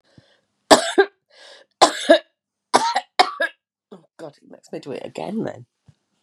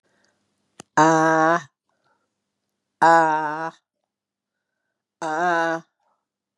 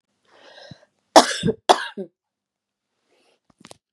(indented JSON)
{
  "three_cough_length": "6.2 s",
  "three_cough_amplitude": 32768,
  "three_cough_signal_mean_std_ratio": 0.31,
  "exhalation_length": "6.6 s",
  "exhalation_amplitude": 28522,
  "exhalation_signal_mean_std_ratio": 0.38,
  "cough_length": "3.9 s",
  "cough_amplitude": 32768,
  "cough_signal_mean_std_ratio": 0.21,
  "survey_phase": "beta (2021-08-13 to 2022-03-07)",
  "age": "45-64",
  "gender": "Female",
  "wearing_mask": "No",
  "symptom_cough_any": true,
  "symptom_runny_or_blocked_nose": true,
  "symptom_fatigue": true,
  "symptom_headache": true,
  "symptom_change_to_sense_of_smell_or_taste": true,
  "symptom_loss_of_taste": true,
  "symptom_onset": "3 days",
  "smoker_status": "Never smoked",
  "respiratory_condition_asthma": false,
  "respiratory_condition_other": false,
  "recruitment_source": "Test and Trace",
  "submission_delay": "2 days",
  "covid_test_result": "Positive",
  "covid_test_method": "RT-qPCR",
  "covid_ct_value": 16.9,
  "covid_ct_gene": "ORF1ab gene",
  "covid_ct_mean": 17.1,
  "covid_viral_load": "2400000 copies/ml",
  "covid_viral_load_category": "High viral load (>1M copies/ml)"
}